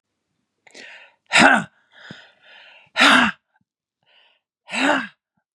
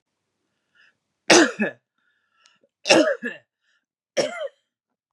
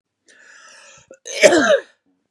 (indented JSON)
{
  "exhalation_length": "5.5 s",
  "exhalation_amplitude": 32767,
  "exhalation_signal_mean_std_ratio": 0.33,
  "three_cough_length": "5.1 s",
  "three_cough_amplitude": 29796,
  "three_cough_signal_mean_std_ratio": 0.3,
  "cough_length": "2.3 s",
  "cough_amplitude": 32768,
  "cough_signal_mean_std_ratio": 0.36,
  "survey_phase": "beta (2021-08-13 to 2022-03-07)",
  "age": "45-64",
  "gender": "Female",
  "wearing_mask": "No",
  "symptom_cough_any": true,
  "symptom_fatigue": true,
  "symptom_onset": "12 days",
  "smoker_status": "Current smoker (1 to 10 cigarettes per day)",
  "respiratory_condition_asthma": false,
  "respiratory_condition_other": false,
  "recruitment_source": "REACT",
  "submission_delay": "1 day",
  "covid_test_result": "Negative",
  "covid_test_method": "RT-qPCR",
  "influenza_a_test_result": "Negative",
  "influenza_b_test_result": "Negative"
}